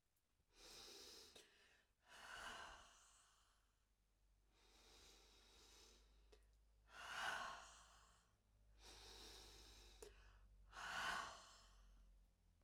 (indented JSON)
{
  "exhalation_length": "12.6 s",
  "exhalation_amplitude": 583,
  "exhalation_signal_mean_std_ratio": 0.52,
  "survey_phase": "beta (2021-08-13 to 2022-03-07)",
  "age": "45-64",
  "gender": "Female",
  "wearing_mask": "No",
  "symptom_none": true,
  "symptom_onset": "5 days",
  "smoker_status": "Never smoked",
  "respiratory_condition_asthma": false,
  "respiratory_condition_other": false,
  "recruitment_source": "REACT",
  "submission_delay": "1 day",
  "covid_test_result": "Negative",
  "covid_test_method": "RT-qPCR",
  "influenza_a_test_result": "Negative",
  "influenza_b_test_result": "Negative"
}